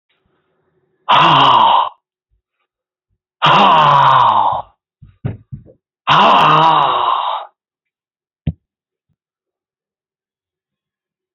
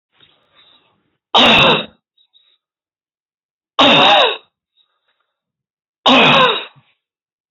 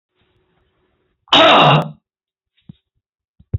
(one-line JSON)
{"exhalation_length": "11.3 s", "exhalation_amplitude": 28943, "exhalation_signal_mean_std_ratio": 0.47, "three_cough_length": "7.5 s", "three_cough_amplitude": 31437, "three_cough_signal_mean_std_ratio": 0.39, "cough_length": "3.6 s", "cough_amplitude": 29829, "cough_signal_mean_std_ratio": 0.34, "survey_phase": "beta (2021-08-13 to 2022-03-07)", "age": "65+", "gender": "Male", "wearing_mask": "No", "symptom_cough_any": true, "symptom_runny_or_blocked_nose": true, "symptom_shortness_of_breath": true, "symptom_sore_throat": true, "smoker_status": "Current smoker (11 or more cigarettes per day)", "respiratory_condition_asthma": true, "respiratory_condition_other": true, "recruitment_source": "REACT", "submission_delay": "1 day", "covid_test_result": "Negative", "covid_test_method": "RT-qPCR", "influenza_a_test_result": "Negative", "influenza_b_test_result": "Negative"}